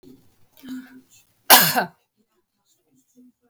cough_length: 3.5 s
cough_amplitude: 32768
cough_signal_mean_std_ratio: 0.24
survey_phase: beta (2021-08-13 to 2022-03-07)
age: 65+
gender: Female
wearing_mask: 'No'
symptom_none: true
symptom_onset: 8 days
smoker_status: Ex-smoker
respiratory_condition_asthma: false
respiratory_condition_other: false
recruitment_source: REACT
submission_delay: 1 day
covid_test_result: Negative
covid_test_method: RT-qPCR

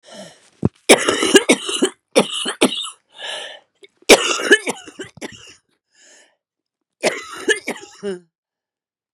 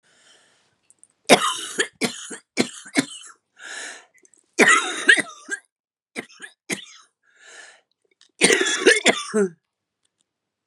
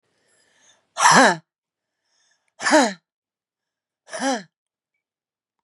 cough_length: 9.1 s
cough_amplitude: 32768
cough_signal_mean_std_ratio: 0.36
three_cough_length: 10.7 s
three_cough_amplitude: 32767
three_cough_signal_mean_std_ratio: 0.35
exhalation_length: 5.6 s
exhalation_amplitude: 31683
exhalation_signal_mean_std_ratio: 0.29
survey_phase: beta (2021-08-13 to 2022-03-07)
age: 45-64
gender: Female
wearing_mask: 'No'
symptom_new_continuous_cough: true
symptom_runny_or_blocked_nose: true
symptom_diarrhoea: true
symptom_fever_high_temperature: true
symptom_headache: true
symptom_loss_of_taste: true
symptom_onset: 3 days
smoker_status: Current smoker (11 or more cigarettes per day)
respiratory_condition_asthma: true
respiratory_condition_other: false
recruitment_source: Test and Trace
submission_delay: 1 day
covid_test_result: Positive
covid_test_method: RT-qPCR
covid_ct_value: 24.0
covid_ct_gene: ORF1ab gene
covid_ct_mean: 24.0
covid_viral_load: 13000 copies/ml
covid_viral_load_category: Low viral load (10K-1M copies/ml)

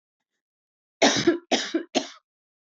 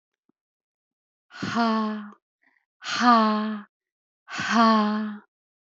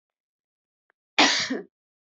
three_cough_length: 2.7 s
three_cough_amplitude: 18097
three_cough_signal_mean_std_ratio: 0.37
exhalation_length: 5.7 s
exhalation_amplitude: 21035
exhalation_signal_mean_std_ratio: 0.48
cough_length: 2.1 s
cough_amplitude: 23306
cough_signal_mean_std_ratio: 0.31
survey_phase: beta (2021-08-13 to 2022-03-07)
age: 45-64
gender: Female
wearing_mask: 'No'
symptom_none: true
smoker_status: Ex-smoker
respiratory_condition_asthma: false
respiratory_condition_other: false
recruitment_source: REACT
submission_delay: 2 days
covid_test_result: Negative
covid_test_method: RT-qPCR
influenza_a_test_result: Negative
influenza_b_test_result: Negative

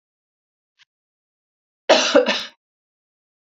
cough_length: 3.5 s
cough_amplitude: 32767
cough_signal_mean_std_ratio: 0.27
survey_phase: beta (2021-08-13 to 2022-03-07)
age: 45-64
gender: Female
wearing_mask: 'No'
symptom_none: true
smoker_status: Never smoked
respiratory_condition_asthma: false
respiratory_condition_other: false
recruitment_source: REACT
submission_delay: 1 day
covid_test_result: Negative
covid_test_method: RT-qPCR
influenza_a_test_result: Negative
influenza_b_test_result: Negative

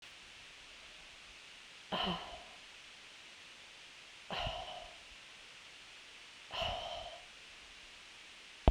exhalation_length: 8.7 s
exhalation_amplitude: 12632
exhalation_signal_mean_std_ratio: 0.43
survey_phase: beta (2021-08-13 to 2022-03-07)
age: 45-64
gender: Female
wearing_mask: 'No'
symptom_none: true
smoker_status: Never smoked
respiratory_condition_asthma: false
respiratory_condition_other: false
recruitment_source: REACT
submission_delay: 2 days
covid_test_result: Negative
covid_test_method: RT-qPCR
influenza_a_test_result: Unknown/Void
influenza_b_test_result: Unknown/Void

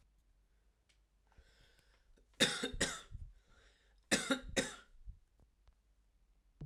cough_length: 6.7 s
cough_amplitude: 5519
cough_signal_mean_std_ratio: 0.32
survey_phase: alpha (2021-03-01 to 2021-08-12)
age: 18-44
gender: Male
wearing_mask: 'No'
symptom_cough_any: true
symptom_fatigue: true
symptom_fever_high_temperature: true
symptom_headache: true
smoker_status: Never smoked
respiratory_condition_asthma: false
respiratory_condition_other: false
recruitment_source: Test and Trace
submission_delay: 1 day
covid_test_result: Positive
covid_test_method: RT-qPCR
covid_ct_value: 15.4
covid_ct_gene: ORF1ab gene
covid_ct_mean: 16.6
covid_viral_load: 3700000 copies/ml
covid_viral_load_category: High viral load (>1M copies/ml)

